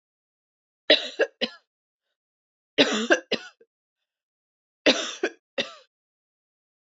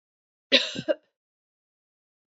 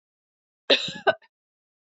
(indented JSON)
{
  "three_cough_length": "6.9 s",
  "three_cough_amplitude": 24131,
  "three_cough_signal_mean_std_ratio": 0.28,
  "exhalation_length": "2.3 s",
  "exhalation_amplitude": 19589,
  "exhalation_signal_mean_std_ratio": 0.24,
  "cough_length": "2.0 s",
  "cough_amplitude": 18654,
  "cough_signal_mean_std_ratio": 0.25,
  "survey_phase": "beta (2021-08-13 to 2022-03-07)",
  "age": "45-64",
  "gender": "Female",
  "wearing_mask": "No",
  "symptom_cough_any": true,
  "symptom_runny_or_blocked_nose": true,
  "symptom_sore_throat": true,
  "symptom_fatigue": true,
  "symptom_fever_high_temperature": true,
  "symptom_headache": true,
  "symptom_onset": "4 days",
  "smoker_status": "Never smoked",
  "respiratory_condition_asthma": false,
  "respiratory_condition_other": false,
  "recruitment_source": "Test and Trace",
  "submission_delay": "2 days",
  "covid_test_result": "Positive",
  "covid_test_method": "ePCR"
}